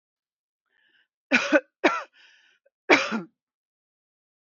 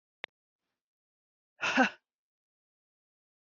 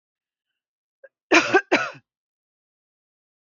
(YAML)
three_cough_length: 4.5 s
three_cough_amplitude: 25153
three_cough_signal_mean_std_ratio: 0.28
exhalation_length: 3.4 s
exhalation_amplitude: 8536
exhalation_signal_mean_std_ratio: 0.21
cough_length: 3.6 s
cough_amplitude: 24601
cough_signal_mean_std_ratio: 0.25
survey_phase: beta (2021-08-13 to 2022-03-07)
age: 45-64
gender: Female
wearing_mask: 'No'
symptom_cough_any: true
symptom_sore_throat: true
symptom_abdominal_pain: true
symptom_headache: true
symptom_onset: 4 days
smoker_status: Never smoked
respiratory_condition_asthma: false
respiratory_condition_other: false
recruitment_source: Test and Trace
submission_delay: 1 day
covid_test_result: Positive
covid_test_method: RT-qPCR
covid_ct_value: 20.2
covid_ct_gene: N gene